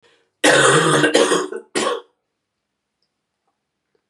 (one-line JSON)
{"cough_length": "4.1 s", "cough_amplitude": 30489, "cough_signal_mean_std_ratio": 0.46, "survey_phase": "beta (2021-08-13 to 2022-03-07)", "age": "45-64", "gender": "Female", "wearing_mask": "No", "symptom_cough_any": true, "symptom_runny_or_blocked_nose": true, "symptom_sore_throat": true, "symptom_headache": true, "symptom_change_to_sense_of_smell_or_taste": true, "symptom_loss_of_taste": true, "symptom_other": true, "symptom_onset": "4 days", "smoker_status": "Ex-smoker", "respiratory_condition_asthma": false, "respiratory_condition_other": false, "recruitment_source": "Test and Trace", "submission_delay": "2 days", "covid_test_result": "Positive", "covid_test_method": "RT-qPCR", "covid_ct_value": 17.4, "covid_ct_gene": "ORF1ab gene", "covid_ct_mean": 18.7, "covid_viral_load": "740000 copies/ml", "covid_viral_load_category": "Low viral load (10K-1M copies/ml)"}